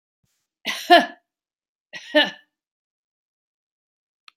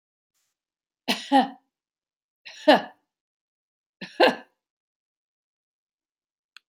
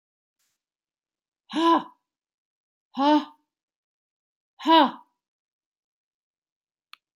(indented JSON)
{
  "cough_length": "4.4 s",
  "cough_amplitude": 27523,
  "cough_signal_mean_std_ratio": 0.22,
  "three_cough_length": "6.7 s",
  "three_cough_amplitude": 22961,
  "three_cough_signal_mean_std_ratio": 0.22,
  "exhalation_length": "7.2 s",
  "exhalation_amplitude": 19636,
  "exhalation_signal_mean_std_ratio": 0.26,
  "survey_phase": "beta (2021-08-13 to 2022-03-07)",
  "age": "65+",
  "gender": "Female",
  "wearing_mask": "No",
  "symptom_none": true,
  "smoker_status": "Never smoked",
  "respiratory_condition_asthma": false,
  "respiratory_condition_other": false,
  "recruitment_source": "REACT",
  "submission_delay": "2 days",
  "covid_test_result": "Negative",
  "covid_test_method": "RT-qPCR"
}